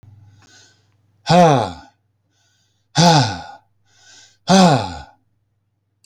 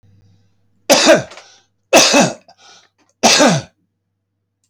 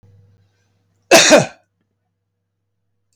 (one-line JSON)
{"exhalation_length": "6.1 s", "exhalation_amplitude": 30700, "exhalation_signal_mean_std_ratio": 0.37, "three_cough_length": "4.7 s", "three_cough_amplitude": 32768, "three_cough_signal_mean_std_ratio": 0.41, "cough_length": "3.2 s", "cough_amplitude": 32694, "cough_signal_mean_std_ratio": 0.27, "survey_phase": "alpha (2021-03-01 to 2021-08-12)", "age": "65+", "gender": "Male", "wearing_mask": "No", "symptom_none": true, "smoker_status": "Never smoked", "respiratory_condition_asthma": false, "respiratory_condition_other": false, "recruitment_source": "REACT", "submission_delay": "2 days", "covid_test_result": "Negative", "covid_test_method": "RT-qPCR"}